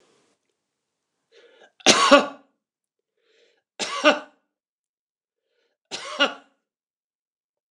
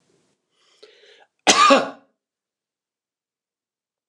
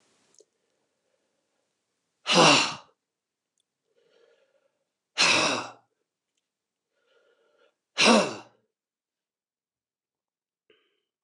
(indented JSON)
{
  "three_cough_length": "7.7 s",
  "three_cough_amplitude": 29204,
  "three_cough_signal_mean_std_ratio": 0.23,
  "cough_length": "4.1 s",
  "cough_amplitude": 29203,
  "cough_signal_mean_std_ratio": 0.24,
  "exhalation_length": "11.2 s",
  "exhalation_amplitude": 18601,
  "exhalation_signal_mean_std_ratio": 0.25,
  "survey_phase": "beta (2021-08-13 to 2022-03-07)",
  "age": "65+",
  "gender": "Male",
  "wearing_mask": "No",
  "symptom_none": true,
  "smoker_status": "Ex-smoker",
  "respiratory_condition_asthma": false,
  "respiratory_condition_other": false,
  "recruitment_source": "REACT",
  "submission_delay": "4 days",
  "covid_test_result": "Negative",
  "covid_test_method": "RT-qPCR",
  "influenza_a_test_result": "Negative",
  "influenza_b_test_result": "Negative"
}